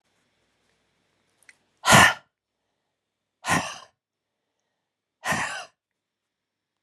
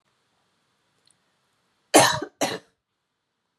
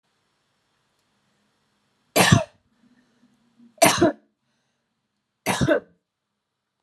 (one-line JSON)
{"exhalation_length": "6.8 s", "exhalation_amplitude": 30474, "exhalation_signal_mean_std_ratio": 0.23, "cough_length": "3.6 s", "cough_amplitude": 27389, "cough_signal_mean_std_ratio": 0.23, "three_cough_length": "6.8 s", "three_cough_amplitude": 27094, "three_cough_signal_mean_std_ratio": 0.27, "survey_phase": "alpha (2021-03-01 to 2021-08-12)", "age": "18-44", "gender": "Female", "wearing_mask": "No", "symptom_none": true, "symptom_onset": "3 days", "smoker_status": "Never smoked", "respiratory_condition_asthma": false, "respiratory_condition_other": false, "recruitment_source": "REACT", "submission_delay": "1 day", "covid_test_result": "Negative", "covid_test_method": "RT-qPCR"}